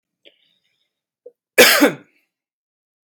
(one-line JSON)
{"cough_length": "3.1 s", "cough_amplitude": 32767, "cough_signal_mean_std_ratio": 0.26, "survey_phase": "beta (2021-08-13 to 2022-03-07)", "age": "18-44", "gender": "Male", "wearing_mask": "No", "symptom_none": true, "symptom_onset": "2 days", "smoker_status": "Ex-smoker", "respiratory_condition_asthma": false, "respiratory_condition_other": false, "recruitment_source": "Test and Trace", "submission_delay": "1 day", "covid_test_result": "Negative", "covid_test_method": "RT-qPCR"}